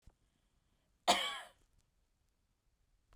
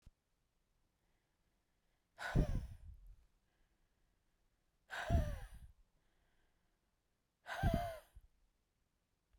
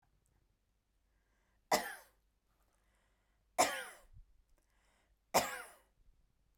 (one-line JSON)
{"cough_length": "3.2 s", "cough_amplitude": 5328, "cough_signal_mean_std_ratio": 0.23, "exhalation_length": "9.4 s", "exhalation_amplitude": 3021, "exhalation_signal_mean_std_ratio": 0.3, "three_cough_length": "6.6 s", "three_cough_amplitude": 4673, "three_cough_signal_mean_std_ratio": 0.24, "survey_phase": "beta (2021-08-13 to 2022-03-07)", "age": "45-64", "gender": "Female", "wearing_mask": "No", "symptom_none": true, "smoker_status": "Ex-smoker", "respiratory_condition_asthma": false, "respiratory_condition_other": false, "recruitment_source": "REACT", "submission_delay": "0 days", "covid_test_result": "Negative", "covid_test_method": "RT-qPCR"}